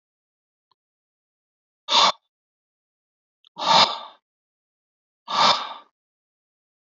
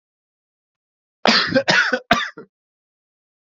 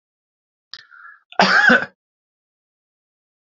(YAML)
exhalation_length: 7.0 s
exhalation_amplitude: 24638
exhalation_signal_mean_std_ratio: 0.28
three_cough_length: 3.5 s
three_cough_amplitude: 30870
three_cough_signal_mean_std_ratio: 0.37
cough_length: 3.5 s
cough_amplitude: 29329
cough_signal_mean_std_ratio: 0.29
survey_phase: beta (2021-08-13 to 2022-03-07)
age: 45-64
gender: Male
wearing_mask: 'No'
symptom_cough_any: true
symptom_runny_or_blocked_nose: true
symptom_sore_throat: true
symptom_headache: true
smoker_status: Never smoked
respiratory_condition_asthma: false
respiratory_condition_other: false
recruitment_source: Test and Trace
submission_delay: 2 days
covid_test_result: Positive
covid_test_method: RT-qPCR
covid_ct_value: 17.9
covid_ct_gene: N gene